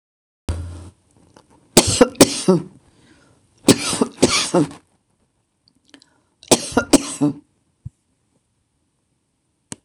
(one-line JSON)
{"three_cough_length": "9.8 s", "three_cough_amplitude": 26028, "three_cough_signal_mean_std_ratio": 0.31, "survey_phase": "beta (2021-08-13 to 2022-03-07)", "age": "65+", "gender": "Female", "wearing_mask": "No", "symptom_none": true, "smoker_status": "Ex-smoker", "respiratory_condition_asthma": false, "respiratory_condition_other": false, "recruitment_source": "REACT", "submission_delay": "3 days", "covid_test_result": "Negative", "covid_test_method": "RT-qPCR", "influenza_a_test_result": "Negative", "influenza_b_test_result": "Negative"}